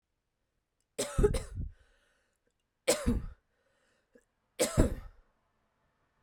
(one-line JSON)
{"three_cough_length": "6.2 s", "three_cough_amplitude": 10692, "three_cough_signal_mean_std_ratio": 0.32, "survey_phase": "beta (2021-08-13 to 2022-03-07)", "age": "18-44", "gender": "Female", "wearing_mask": "No", "symptom_cough_any": true, "symptom_runny_or_blocked_nose": true, "symptom_sore_throat": true, "symptom_fever_high_temperature": true, "symptom_headache": true, "symptom_change_to_sense_of_smell_or_taste": true, "symptom_loss_of_taste": true, "smoker_status": "Ex-smoker", "respiratory_condition_asthma": false, "respiratory_condition_other": false, "recruitment_source": "Test and Trace", "submission_delay": "3 days", "covid_test_result": "Positive", "covid_test_method": "RT-qPCR", "covid_ct_value": 22.3, "covid_ct_gene": "ORF1ab gene"}